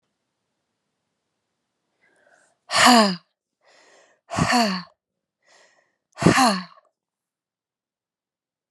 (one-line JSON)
{"exhalation_length": "8.7 s", "exhalation_amplitude": 30144, "exhalation_signal_mean_std_ratio": 0.29, "survey_phase": "alpha (2021-03-01 to 2021-08-12)", "age": "45-64", "gender": "Female", "wearing_mask": "No", "symptom_cough_any": true, "symptom_shortness_of_breath": true, "symptom_fatigue": true, "symptom_change_to_sense_of_smell_or_taste": true, "symptom_loss_of_taste": true, "symptom_onset": "3 days", "smoker_status": "Ex-smoker", "respiratory_condition_asthma": false, "respiratory_condition_other": false, "recruitment_source": "Test and Trace", "submission_delay": "2 days", "covid_test_result": "Positive", "covid_test_method": "RT-qPCR", "covid_ct_value": 14.8, "covid_ct_gene": "ORF1ab gene", "covid_ct_mean": 15.1, "covid_viral_load": "11000000 copies/ml", "covid_viral_load_category": "High viral load (>1M copies/ml)"}